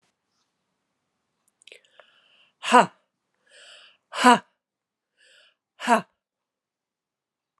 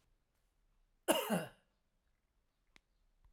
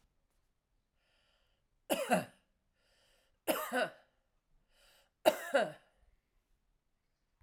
{"exhalation_length": "7.6 s", "exhalation_amplitude": 31161, "exhalation_signal_mean_std_ratio": 0.18, "cough_length": "3.3 s", "cough_amplitude": 6515, "cough_signal_mean_std_ratio": 0.26, "three_cough_length": "7.4 s", "three_cough_amplitude": 8323, "three_cough_signal_mean_std_ratio": 0.27, "survey_phase": "alpha (2021-03-01 to 2021-08-12)", "age": "65+", "gender": "Female", "wearing_mask": "No", "symptom_shortness_of_breath": true, "symptom_diarrhoea": true, "symptom_fatigue": true, "symptom_fever_high_temperature": true, "symptom_headache": true, "symptom_change_to_sense_of_smell_or_taste": true, "symptom_loss_of_taste": true, "symptom_onset": "5 days", "smoker_status": "Never smoked", "respiratory_condition_asthma": false, "respiratory_condition_other": false, "recruitment_source": "Test and Trace", "submission_delay": "3 days", "covid_test_result": "Positive", "covid_test_method": "RT-qPCR", "covid_ct_value": 19.4, "covid_ct_gene": "ORF1ab gene"}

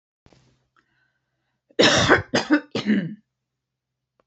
{"three_cough_length": "4.3 s", "three_cough_amplitude": 25829, "three_cough_signal_mean_std_ratio": 0.37, "survey_phase": "alpha (2021-03-01 to 2021-08-12)", "age": "65+", "gender": "Female", "wearing_mask": "No", "symptom_none": true, "smoker_status": "Ex-smoker", "respiratory_condition_asthma": false, "respiratory_condition_other": false, "recruitment_source": "REACT", "submission_delay": "2 days", "covid_test_result": "Negative", "covid_test_method": "RT-qPCR"}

